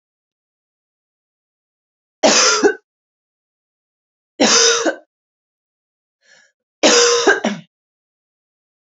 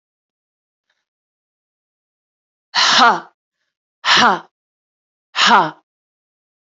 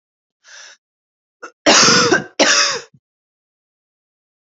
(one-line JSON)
{"three_cough_length": "8.9 s", "three_cough_amplitude": 32767, "three_cough_signal_mean_std_ratio": 0.35, "exhalation_length": "6.7 s", "exhalation_amplitude": 32768, "exhalation_signal_mean_std_ratio": 0.32, "cough_length": "4.4 s", "cough_amplitude": 31291, "cough_signal_mean_std_ratio": 0.38, "survey_phase": "alpha (2021-03-01 to 2021-08-12)", "age": "18-44", "gender": "Female", "wearing_mask": "No", "symptom_cough_any": true, "symptom_headache": true, "symptom_change_to_sense_of_smell_or_taste": true, "smoker_status": "Never smoked", "respiratory_condition_asthma": false, "respiratory_condition_other": false, "recruitment_source": "Test and Trace", "submission_delay": "2 days", "covid_test_result": "Positive"}